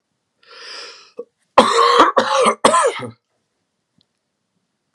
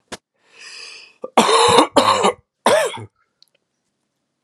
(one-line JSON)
{"cough_length": "4.9 s", "cough_amplitude": 32768, "cough_signal_mean_std_ratio": 0.41, "three_cough_length": "4.4 s", "three_cough_amplitude": 32768, "three_cough_signal_mean_std_ratio": 0.43, "survey_phase": "alpha (2021-03-01 to 2021-08-12)", "age": "18-44", "gender": "Male", "wearing_mask": "No", "symptom_cough_any": true, "symptom_new_continuous_cough": true, "symptom_shortness_of_breath": true, "symptom_fatigue": true, "symptom_fever_high_temperature": true, "symptom_headache": true, "symptom_change_to_sense_of_smell_or_taste": true, "symptom_loss_of_taste": true, "symptom_onset": "3 days", "smoker_status": "Never smoked", "respiratory_condition_asthma": false, "respiratory_condition_other": false, "recruitment_source": "Test and Trace", "submission_delay": "2 days", "covid_test_result": "Positive", "covid_test_method": "RT-qPCR", "covid_ct_value": 15.6, "covid_ct_gene": "N gene", "covid_ct_mean": 15.9, "covid_viral_load": "6100000 copies/ml", "covid_viral_load_category": "High viral load (>1M copies/ml)"}